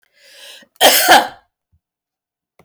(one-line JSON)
{"cough_length": "2.6 s", "cough_amplitude": 32768, "cough_signal_mean_std_ratio": 0.34, "survey_phase": "beta (2021-08-13 to 2022-03-07)", "age": "65+", "gender": "Female", "wearing_mask": "No", "symptom_none": true, "smoker_status": "Never smoked", "respiratory_condition_asthma": false, "respiratory_condition_other": false, "recruitment_source": "REACT", "submission_delay": "1 day", "covid_test_result": "Negative", "covid_test_method": "RT-qPCR"}